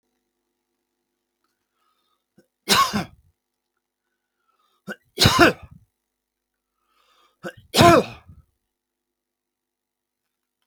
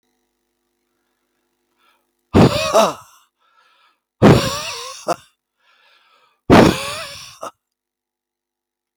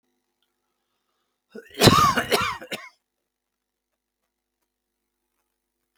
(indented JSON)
{
  "three_cough_length": "10.7 s",
  "three_cough_amplitude": 32768,
  "three_cough_signal_mean_std_ratio": 0.23,
  "exhalation_length": "9.0 s",
  "exhalation_amplitude": 32768,
  "exhalation_signal_mean_std_ratio": 0.3,
  "cough_length": "6.0 s",
  "cough_amplitude": 26077,
  "cough_signal_mean_std_ratio": 0.26,
  "survey_phase": "alpha (2021-03-01 to 2021-08-12)",
  "age": "65+",
  "gender": "Male",
  "wearing_mask": "No",
  "symptom_none": true,
  "smoker_status": "Never smoked",
  "respiratory_condition_asthma": false,
  "respiratory_condition_other": false,
  "recruitment_source": "REACT",
  "submission_delay": "1 day",
  "covid_test_result": "Negative",
  "covid_test_method": "RT-qPCR"
}